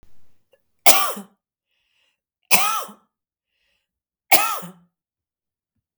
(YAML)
three_cough_length: 6.0 s
three_cough_amplitude: 32768
three_cough_signal_mean_std_ratio: 0.28
survey_phase: beta (2021-08-13 to 2022-03-07)
age: 45-64
gender: Female
wearing_mask: 'No'
symptom_none: true
smoker_status: Never smoked
respiratory_condition_asthma: false
respiratory_condition_other: false
recruitment_source: REACT
submission_delay: 0 days
covid_test_result: Negative
covid_test_method: RT-qPCR